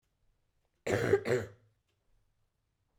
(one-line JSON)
{"cough_length": "3.0 s", "cough_amplitude": 6865, "cough_signal_mean_std_ratio": 0.33, "survey_phase": "beta (2021-08-13 to 2022-03-07)", "age": "18-44", "gender": "Female", "wearing_mask": "Yes", "symptom_fatigue": true, "symptom_fever_high_temperature": true, "symptom_onset": "3 days", "smoker_status": "Never smoked", "respiratory_condition_asthma": false, "respiratory_condition_other": false, "recruitment_source": "Test and Trace", "submission_delay": "2 days", "covid_test_result": "Positive", "covid_test_method": "RT-qPCR", "covid_ct_value": 18.8, "covid_ct_gene": "ORF1ab gene", "covid_ct_mean": 19.0, "covid_viral_load": "580000 copies/ml", "covid_viral_load_category": "Low viral load (10K-1M copies/ml)"}